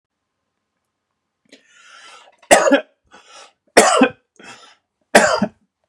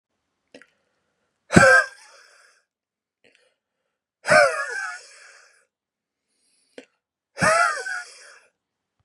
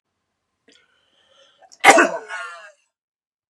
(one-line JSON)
{"three_cough_length": "5.9 s", "three_cough_amplitude": 32768, "three_cough_signal_mean_std_ratio": 0.31, "exhalation_length": "9.0 s", "exhalation_amplitude": 32767, "exhalation_signal_mean_std_ratio": 0.29, "cough_length": "3.5 s", "cough_amplitude": 32768, "cough_signal_mean_std_ratio": 0.24, "survey_phase": "beta (2021-08-13 to 2022-03-07)", "age": "45-64", "gender": "Male", "wearing_mask": "No", "symptom_none": true, "smoker_status": "Never smoked", "respiratory_condition_asthma": false, "respiratory_condition_other": false, "recruitment_source": "REACT", "submission_delay": "3 days", "covid_test_result": "Negative", "covid_test_method": "RT-qPCR", "influenza_a_test_result": "Negative", "influenza_b_test_result": "Negative"}